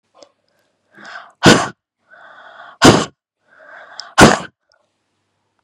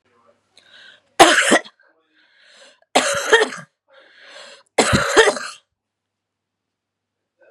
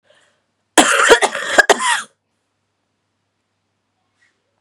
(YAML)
exhalation_length: 5.6 s
exhalation_amplitude: 32768
exhalation_signal_mean_std_ratio: 0.28
three_cough_length: 7.5 s
three_cough_amplitude: 32768
three_cough_signal_mean_std_ratio: 0.33
cough_length: 4.6 s
cough_amplitude: 32768
cough_signal_mean_std_ratio: 0.33
survey_phase: beta (2021-08-13 to 2022-03-07)
age: 45-64
gender: Female
wearing_mask: 'No'
symptom_new_continuous_cough: true
symptom_runny_or_blocked_nose: true
symptom_headache: true
smoker_status: Never smoked
respiratory_condition_asthma: false
respiratory_condition_other: false
recruitment_source: Test and Trace
submission_delay: 1 day
covid_test_result: Negative
covid_test_method: ePCR